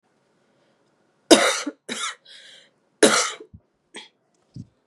{
  "three_cough_length": "4.9 s",
  "three_cough_amplitude": 32767,
  "three_cough_signal_mean_std_ratio": 0.28,
  "survey_phase": "beta (2021-08-13 to 2022-03-07)",
  "age": "18-44",
  "gender": "Female",
  "wearing_mask": "No",
  "symptom_cough_any": true,
  "symptom_new_continuous_cough": true,
  "symptom_runny_or_blocked_nose": true,
  "symptom_shortness_of_breath": true,
  "symptom_abdominal_pain": true,
  "symptom_fatigue": true,
  "symptom_fever_high_temperature": true,
  "symptom_headache": true,
  "symptom_onset": "5 days",
  "smoker_status": "Never smoked",
  "respiratory_condition_asthma": false,
  "respiratory_condition_other": false,
  "recruitment_source": "Test and Trace",
  "submission_delay": "2 days",
  "covid_test_result": "Positive",
  "covid_test_method": "RT-qPCR",
  "covid_ct_value": 11.4,
  "covid_ct_gene": "ORF1ab gene"
}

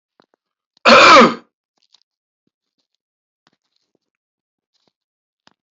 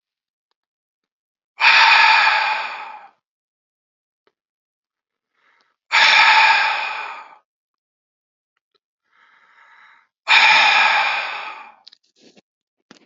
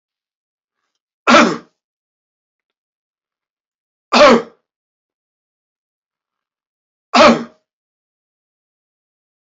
{
  "cough_length": "5.7 s",
  "cough_amplitude": 32767,
  "cough_signal_mean_std_ratio": 0.25,
  "exhalation_length": "13.1 s",
  "exhalation_amplitude": 29954,
  "exhalation_signal_mean_std_ratio": 0.41,
  "three_cough_length": "9.6 s",
  "three_cough_amplitude": 30090,
  "three_cough_signal_mean_std_ratio": 0.24,
  "survey_phase": "beta (2021-08-13 to 2022-03-07)",
  "age": "65+",
  "gender": "Male",
  "wearing_mask": "No",
  "symptom_cough_any": true,
  "symptom_runny_or_blocked_nose": true,
  "symptom_fatigue": true,
  "smoker_status": "Ex-smoker",
  "respiratory_condition_asthma": false,
  "respiratory_condition_other": false,
  "recruitment_source": "Test and Trace",
  "submission_delay": "2 days",
  "covid_test_result": "Positive",
  "covid_test_method": "LAMP"
}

